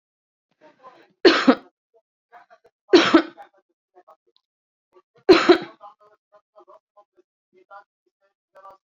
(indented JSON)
{
  "three_cough_length": "8.9 s",
  "three_cough_amplitude": 28476,
  "three_cough_signal_mean_std_ratio": 0.23,
  "survey_phase": "beta (2021-08-13 to 2022-03-07)",
  "age": "45-64",
  "gender": "Female",
  "wearing_mask": "No",
  "symptom_none": true,
  "smoker_status": "Current smoker (1 to 10 cigarettes per day)",
  "respiratory_condition_asthma": false,
  "respiratory_condition_other": false,
  "recruitment_source": "REACT",
  "submission_delay": "1 day",
  "covid_test_result": "Negative",
  "covid_test_method": "RT-qPCR"
}